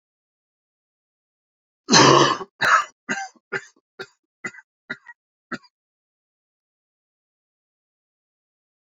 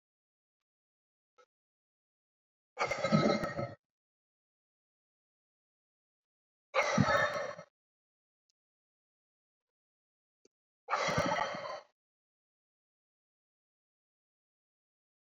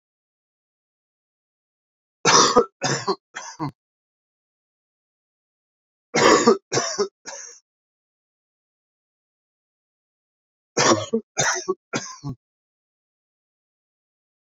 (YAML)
cough_length: 9.0 s
cough_amplitude: 32250
cough_signal_mean_std_ratio: 0.24
exhalation_length: 15.4 s
exhalation_amplitude: 6422
exhalation_signal_mean_std_ratio: 0.3
three_cough_length: 14.4 s
three_cough_amplitude: 28197
three_cough_signal_mean_std_ratio: 0.29
survey_phase: beta (2021-08-13 to 2022-03-07)
age: 45-64
gender: Male
wearing_mask: 'No'
symptom_cough_any: true
symptom_runny_or_blocked_nose: true
symptom_sore_throat: true
symptom_diarrhoea: true
symptom_headache: true
smoker_status: Never smoked
respiratory_condition_asthma: false
respiratory_condition_other: false
recruitment_source: Test and Trace
submission_delay: 2 days
covid_test_result: Positive
covid_test_method: RT-qPCR
covid_ct_value: 12.4
covid_ct_gene: ORF1ab gene
covid_ct_mean: 12.5
covid_viral_load: 81000000 copies/ml
covid_viral_load_category: High viral load (>1M copies/ml)